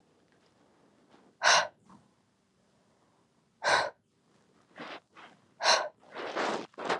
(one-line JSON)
{"exhalation_length": "7.0 s", "exhalation_amplitude": 11924, "exhalation_signal_mean_std_ratio": 0.34, "survey_phase": "beta (2021-08-13 to 2022-03-07)", "age": "18-44", "gender": "Female", "wearing_mask": "No", "symptom_cough_any": true, "symptom_runny_or_blocked_nose": true, "symptom_shortness_of_breath": true, "symptom_diarrhoea": true, "symptom_fatigue": true, "symptom_headache": true, "symptom_onset": "5 days", "smoker_status": "Current smoker (1 to 10 cigarettes per day)", "respiratory_condition_asthma": true, "respiratory_condition_other": false, "recruitment_source": "REACT", "submission_delay": "1 day", "covid_test_result": "Positive", "covid_test_method": "RT-qPCR", "covid_ct_value": 20.8, "covid_ct_gene": "E gene", "influenza_a_test_result": "Negative", "influenza_b_test_result": "Negative"}